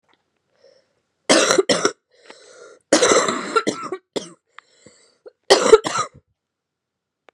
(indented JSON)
{
  "cough_length": "7.3 s",
  "cough_amplitude": 32768,
  "cough_signal_mean_std_ratio": 0.35,
  "survey_phase": "beta (2021-08-13 to 2022-03-07)",
  "age": "18-44",
  "gender": "Female",
  "wearing_mask": "No",
  "symptom_cough_any": true,
  "symptom_new_continuous_cough": true,
  "symptom_runny_or_blocked_nose": true,
  "symptom_shortness_of_breath": true,
  "symptom_sore_throat": true,
  "symptom_headache": true,
  "symptom_other": true,
  "symptom_onset": "2 days",
  "smoker_status": "Current smoker (e-cigarettes or vapes only)",
  "respiratory_condition_asthma": false,
  "respiratory_condition_other": false,
  "recruitment_source": "Test and Trace",
  "submission_delay": "2 days",
  "covid_test_result": "Positive",
  "covid_test_method": "RT-qPCR",
  "covid_ct_value": 16.6,
  "covid_ct_gene": "ORF1ab gene",
  "covid_ct_mean": 17.0,
  "covid_viral_load": "2600000 copies/ml",
  "covid_viral_load_category": "High viral load (>1M copies/ml)"
}